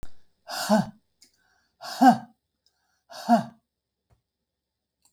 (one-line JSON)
{"exhalation_length": "5.1 s", "exhalation_amplitude": 19936, "exhalation_signal_mean_std_ratio": 0.29, "survey_phase": "beta (2021-08-13 to 2022-03-07)", "age": "65+", "gender": "Female", "wearing_mask": "No", "symptom_none": true, "symptom_onset": "6 days", "smoker_status": "Ex-smoker", "respiratory_condition_asthma": false, "respiratory_condition_other": false, "recruitment_source": "REACT", "submission_delay": "1 day", "covid_test_result": "Negative", "covid_test_method": "RT-qPCR", "influenza_a_test_result": "Negative", "influenza_b_test_result": "Negative"}